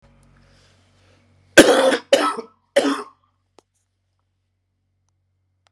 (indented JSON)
{
  "three_cough_length": "5.7 s",
  "three_cough_amplitude": 32768,
  "three_cough_signal_mean_std_ratio": 0.28,
  "survey_phase": "beta (2021-08-13 to 2022-03-07)",
  "age": "45-64",
  "gender": "Male",
  "wearing_mask": "No",
  "symptom_none": true,
  "smoker_status": "Current smoker (1 to 10 cigarettes per day)",
  "respiratory_condition_asthma": false,
  "respiratory_condition_other": false,
  "recruitment_source": "REACT",
  "submission_delay": "9 days",
  "covid_test_result": "Negative",
  "covid_test_method": "RT-qPCR"
}